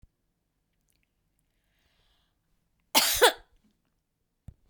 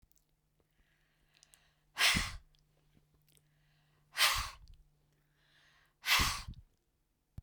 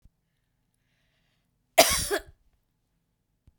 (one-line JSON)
{"three_cough_length": "4.7 s", "three_cough_amplitude": 21163, "three_cough_signal_mean_std_ratio": 0.2, "exhalation_length": "7.4 s", "exhalation_amplitude": 5750, "exhalation_signal_mean_std_ratio": 0.3, "cough_length": "3.6 s", "cough_amplitude": 27561, "cough_signal_mean_std_ratio": 0.21, "survey_phase": "beta (2021-08-13 to 2022-03-07)", "age": "65+", "gender": "Female", "wearing_mask": "No", "symptom_none": true, "smoker_status": "Ex-smoker", "respiratory_condition_asthma": false, "respiratory_condition_other": false, "recruitment_source": "REACT", "submission_delay": "1 day", "covid_test_result": "Negative", "covid_test_method": "RT-qPCR", "influenza_a_test_result": "Negative", "influenza_b_test_result": "Negative"}